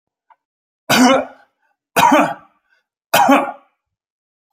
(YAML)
three_cough_length: 4.5 s
three_cough_amplitude: 32767
three_cough_signal_mean_std_ratio: 0.41
survey_phase: alpha (2021-03-01 to 2021-08-12)
age: 45-64
gender: Male
wearing_mask: 'No'
symptom_none: true
smoker_status: Never smoked
respiratory_condition_asthma: false
respiratory_condition_other: false
recruitment_source: REACT
submission_delay: 2 days
covid_test_result: Negative
covid_test_method: RT-qPCR